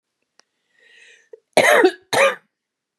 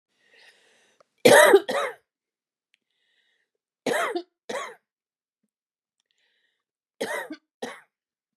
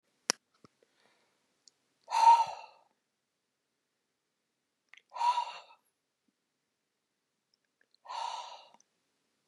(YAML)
cough_length: 3.0 s
cough_amplitude: 30230
cough_signal_mean_std_ratio: 0.36
three_cough_length: 8.4 s
three_cough_amplitude: 28640
three_cough_signal_mean_std_ratio: 0.25
exhalation_length: 9.5 s
exhalation_amplitude: 19476
exhalation_signal_mean_std_ratio: 0.22
survey_phase: beta (2021-08-13 to 2022-03-07)
age: 45-64
gender: Female
wearing_mask: 'No'
symptom_none: true
smoker_status: Never smoked
respiratory_condition_asthma: false
respiratory_condition_other: false
recruitment_source: REACT
submission_delay: 1 day
covid_test_result: Negative
covid_test_method: RT-qPCR
influenza_a_test_result: Negative
influenza_b_test_result: Negative